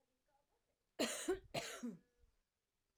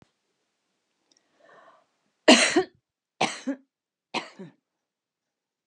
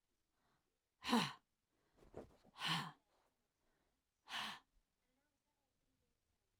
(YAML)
cough_length: 3.0 s
cough_amplitude: 1533
cough_signal_mean_std_ratio: 0.39
three_cough_length: 5.7 s
three_cough_amplitude: 24676
three_cough_signal_mean_std_ratio: 0.22
exhalation_length: 6.6 s
exhalation_amplitude: 2136
exhalation_signal_mean_std_ratio: 0.27
survey_phase: alpha (2021-03-01 to 2021-08-12)
age: 65+
gender: Female
wearing_mask: 'No'
symptom_none: true
smoker_status: Ex-smoker
respiratory_condition_asthma: true
respiratory_condition_other: false
recruitment_source: REACT
submission_delay: 2 days
covid_test_result: Negative
covid_test_method: RT-qPCR